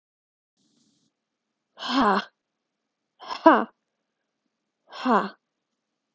exhalation_length: 6.1 s
exhalation_amplitude: 28864
exhalation_signal_mean_std_ratio: 0.25
survey_phase: alpha (2021-03-01 to 2021-08-12)
age: 18-44
gender: Female
wearing_mask: 'No'
symptom_cough_any: true
symptom_fatigue: true
symptom_fever_high_temperature: true
symptom_headache: true
symptom_change_to_sense_of_smell_or_taste: true
symptom_loss_of_taste: true
symptom_onset: 4 days
smoker_status: Never smoked
respiratory_condition_asthma: false
respiratory_condition_other: false
recruitment_source: Test and Trace
submission_delay: 2 days
covid_test_result: Positive
covid_test_method: RT-qPCR
covid_ct_value: 13.2
covid_ct_gene: ORF1ab gene
covid_ct_mean: 13.3
covid_viral_load: 43000000 copies/ml
covid_viral_load_category: High viral load (>1M copies/ml)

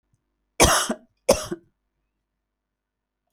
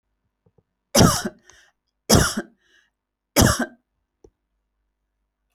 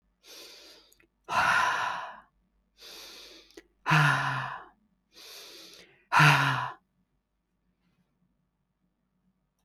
cough_length: 3.3 s
cough_amplitude: 25748
cough_signal_mean_std_ratio: 0.27
three_cough_length: 5.5 s
three_cough_amplitude: 28174
three_cough_signal_mean_std_ratio: 0.29
exhalation_length: 9.6 s
exhalation_amplitude: 13980
exhalation_signal_mean_std_ratio: 0.37
survey_phase: beta (2021-08-13 to 2022-03-07)
age: 45-64
gender: Female
wearing_mask: 'No'
symptom_none: true
smoker_status: Never smoked
respiratory_condition_asthma: false
respiratory_condition_other: false
recruitment_source: REACT
submission_delay: 1 day
covid_test_result: Negative
covid_test_method: RT-qPCR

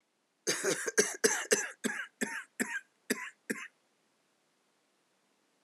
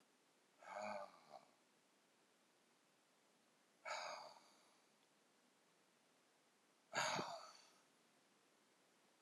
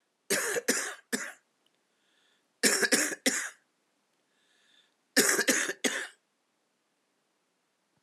cough_length: 5.6 s
cough_amplitude: 8875
cough_signal_mean_std_ratio: 0.4
exhalation_length: 9.2 s
exhalation_amplitude: 1154
exhalation_signal_mean_std_ratio: 0.36
three_cough_length: 8.0 s
three_cough_amplitude: 12104
three_cough_signal_mean_std_ratio: 0.39
survey_phase: alpha (2021-03-01 to 2021-08-12)
age: 65+
gender: Male
wearing_mask: 'No'
symptom_cough_any: true
symptom_fatigue: true
symptom_fever_high_temperature: true
symptom_loss_of_taste: true
symptom_onset: 5 days
smoker_status: Ex-smoker
respiratory_condition_asthma: false
respiratory_condition_other: false
recruitment_source: Test and Trace
submission_delay: 2 days
covid_test_result: Positive
covid_test_method: RT-qPCR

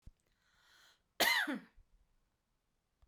cough_length: 3.1 s
cough_amplitude: 3835
cough_signal_mean_std_ratio: 0.29
survey_phase: beta (2021-08-13 to 2022-03-07)
age: 45-64
gender: Female
wearing_mask: 'No'
symptom_none: true
smoker_status: Ex-smoker
respiratory_condition_asthma: false
respiratory_condition_other: false
recruitment_source: REACT
submission_delay: 2 days
covid_test_result: Negative
covid_test_method: RT-qPCR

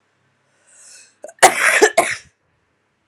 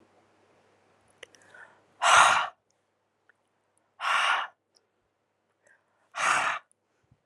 cough_length: 3.1 s
cough_amplitude: 32768
cough_signal_mean_std_ratio: 0.33
exhalation_length: 7.3 s
exhalation_amplitude: 21139
exhalation_signal_mean_std_ratio: 0.32
survey_phase: alpha (2021-03-01 to 2021-08-12)
age: 18-44
gender: Female
wearing_mask: 'No'
symptom_cough_any: true
symptom_change_to_sense_of_smell_or_taste: true
symptom_onset: 8 days
smoker_status: Current smoker (11 or more cigarettes per day)
respiratory_condition_asthma: false
respiratory_condition_other: false
recruitment_source: Test and Trace
submission_delay: 2 days
covid_test_result: Positive
covid_test_method: RT-qPCR
covid_ct_value: 23.2
covid_ct_gene: N gene
covid_ct_mean: 23.2
covid_viral_load: 24000 copies/ml
covid_viral_load_category: Low viral load (10K-1M copies/ml)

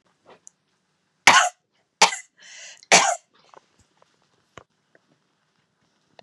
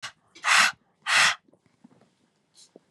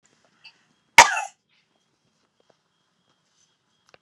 three_cough_length: 6.2 s
three_cough_amplitude: 32767
three_cough_signal_mean_std_ratio: 0.23
exhalation_length: 2.9 s
exhalation_amplitude: 18969
exhalation_signal_mean_std_ratio: 0.36
cough_length: 4.0 s
cough_amplitude: 32768
cough_signal_mean_std_ratio: 0.14
survey_phase: beta (2021-08-13 to 2022-03-07)
age: 18-44
gender: Female
wearing_mask: 'No'
symptom_none: true
smoker_status: Never smoked
respiratory_condition_asthma: false
respiratory_condition_other: false
recruitment_source: REACT
submission_delay: 1 day
covid_test_result: Negative
covid_test_method: RT-qPCR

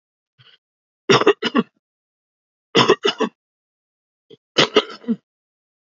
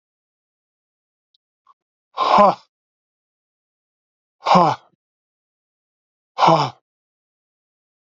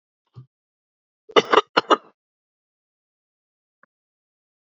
three_cough_length: 5.9 s
three_cough_amplitude: 29190
three_cough_signal_mean_std_ratio: 0.3
exhalation_length: 8.2 s
exhalation_amplitude: 29143
exhalation_signal_mean_std_ratio: 0.26
cough_length: 4.7 s
cough_amplitude: 32767
cough_signal_mean_std_ratio: 0.17
survey_phase: alpha (2021-03-01 to 2021-08-12)
age: 65+
gender: Male
wearing_mask: 'No'
symptom_cough_any: true
symptom_onset: 12 days
smoker_status: Ex-smoker
respiratory_condition_asthma: true
respiratory_condition_other: true
recruitment_source: REACT
submission_delay: 2 days
covid_test_result: Negative
covid_test_method: RT-qPCR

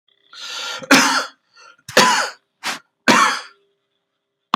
three_cough_length: 4.6 s
three_cough_amplitude: 32768
three_cough_signal_mean_std_ratio: 0.41
survey_phase: beta (2021-08-13 to 2022-03-07)
age: 45-64
gender: Male
wearing_mask: 'No'
symptom_none: true
smoker_status: Never smoked
respiratory_condition_asthma: false
respiratory_condition_other: false
recruitment_source: REACT
submission_delay: 2 days
covid_test_result: Negative
covid_test_method: RT-qPCR
influenza_a_test_result: Negative
influenza_b_test_result: Negative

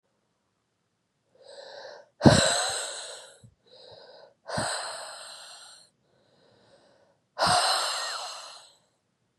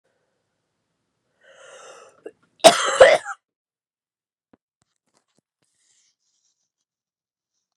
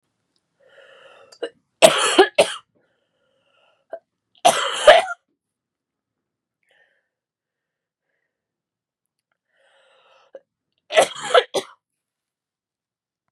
exhalation_length: 9.4 s
exhalation_amplitude: 25695
exhalation_signal_mean_std_ratio: 0.35
cough_length: 7.8 s
cough_amplitude: 32768
cough_signal_mean_std_ratio: 0.18
three_cough_length: 13.3 s
three_cough_amplitude: 32768
three_cough_signal_mean_std_ratio: 0.23
survey_phase: beta (2021-08-13 to 2022-03-07)
age: 18-44
gender: Female
wearing_mask: 'No'
symptom_cough_any: true
symptom_runny_or_blocked_nose: true
symptom_abdominal_pain: true
symptom_diarrhoea: true
symptom_fatigue: true
symptom_headache: true
symptom_onset: 4 days
smoker_status: Never smoked
respiratory_condition_asthma: false
respiratory_condition_other: false
recruitment_source: Test and Trace
submission_delay: 2 days
covid_test_result: Positive
covid_test_method: LAMP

